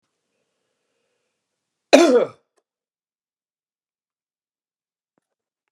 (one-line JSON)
{"cough_length": "5.7 s", "cough_amplitude": 32768, "cough_signal_mean_std_ratio": 0.19, "survey_phase": "beta (2021-08-13 to 2022-03-07)", "age": "45-64", "gender": "Male", "wearing_mask": "No", "symptom_none": true, "smoker_status": "Never smoked", "respiratory_condition_asthma": false, "respiratory_condition_other": false, "recruitment_source": "REACT", "submission_delay": "2 days", "covid_test_result": "Negative", "covid_test_method": "RT-qPCR", "influenza_a_test_result": "Negative", "influenza_b_test_result": "Negative"}